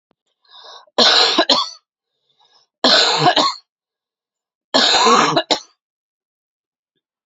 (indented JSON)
{
  "three_cough_length": "7.3 s",
  "three_cough_amplitude": 32377,
  "three_cough_signal_mean_std_ratio": 0.45,
  "survey_phase": "beta (2021-08-13 to 2022-03-07)",
  "age": "18-44",
  "gender": "Female",
  "wearing_mask": "No",
  "symptom_cough_any": true,
  "symptom_fatigue": true,
  "symptom_headache": true,
  "symptom_change_to_sense_of_smell_or_taste": true,
  "symptom_loss_of_taste": true,
  "symptom_other": true,
  "symptom_onset": "4 days",
  "smoker_status": "Never smoked",
  "respiratory_condition_asthma": false,
  "respiratory_condition_other": false,
  "recruitment_source": "Test and Trace",
  "submission_delay": "2 days",
  "covid_test_result": "Positive",
  "covid_test_method": "RT-qPCR",
  "covid_ct_value": 23.9,
  "covid_ct_gene": "N gene"
}